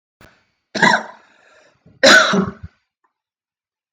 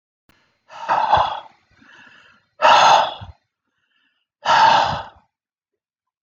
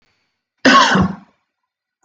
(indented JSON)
{
  "three_cough_length": "3.9 s",
  "three_cough_amplitude": 32768,
  "three_cough_signal_mean_std_ratio": 0.33,
  "exhalation_length": "6.2 s",
  "exhalation_amplitude": 32768,
  "exhalation_signal_mean_std_ratio": 0.41,
  "cough_length": "2.0 s",
  "cough_amplitude": 32768,
  "cough_signal_mean_std_ratio": 0.4,
  "survey_phase": "beta (2021-08-13 to 2022-03-07)",
  "age": "45-64",
  "gender": "Male",
  "wearing_mask": "No",
  "symptom_none": true,
  "smoker_status": "Never smoked",
  "respiratory_condition_asthma": false,
  "respiratory_condition_other": false,
  "recruitment_source": "REACT",
  "submission_delay": "1 day",
  "covid_test_result": "Negative",
  "covid_test_method": "RT-qPCR"
}